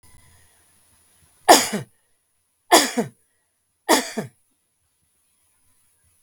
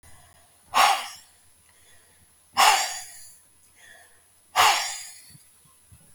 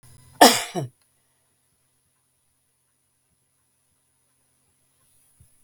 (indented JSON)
{
  "three_cough_length": "6.2 s",
  "three_cough_amplitude": 32766,
  "three_cough_signal_mean_std_ratio": 0.24,
  "exhalation_length": "6.1 s",
  "exhalation_amplitude": 19523,
  "exhalation_signal_mean_std_ratio": 0.35,
  "cough_length": "5.6 s",
  "cough_amplitude": 32768,
  "cough_signal_mean_std_ratio": 0.15,
  "survey_phase": "beta (2021-08-13 to 2022-03-07)",
  "age": "65+",
  "gender": "Female",
  "wearing_mask": "No",
  "symptom_none": true,
  "smoker_status": "Ex-smoker",
  "respiratory_condition_asthma": false,
  "respiratory_condition_other": false,
  "recruitment_source": "REACT",
  "submission_delay": "2 days",
  "covid_test_result": "Negative",
  "covid_test_method": "RT-qPCR",
  "influenza_a_test_result": "Negative",
  "influenza_b_test_result": "Negative"
}